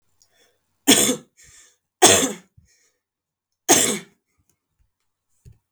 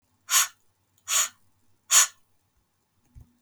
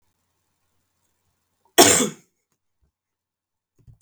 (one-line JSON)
{"three_cough_length": "5.7 s", "three_cough_amplitude": 32768, "three_cough_signal_mean_std_ratio": 0.29, "exhalation_length": "3.4 s", "exhalation_amplitude": 21646, "exhalation_signal_mean_std_ratio": 0.3, "cough_length": "4.0 s", "cough_amplitude": 32768, "cough_signal_mean_std_ratio": 0.2, "survey_phase": "beta (2021-08-13 to 2022-03-07)", "age": "18-44", "gender": "Female", "wearing_mask": "No", "symptom_other": true, "smoker_status": "Current smoker (1 to 10 cigarettes per day)", "respiratory_condition_asthma": false, "respiratory_condition_other": false, "recruitment_source": "REACT", "submission_delay": "1 day", "covid_test_result": "Negative", "covid_test_method": "RT-qPCR", "influenza_a_test_result": "Negative", "influenza_b_test_result": "Negative"}